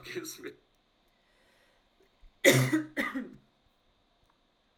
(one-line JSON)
{"cough_length": "4.8 s", "cough_amplitude": 13750, "cough_signal_mean_std_ratio": 0.3, "survey_phase": "alpha (2021-03-01 to 2021-08-12)", "age": "18-44", "gender": "Female", "wearing_mask": "No", "symptom_none": true, "smoker_status": "Never smoked", "respiratory_condition_asthma": true, "respiratory_condition_other": false, "recruitment_source": "REACT", "submission_delay": "1 day", "covid_test_result": "Negative", "covid_test_method": "RT-qPCR"}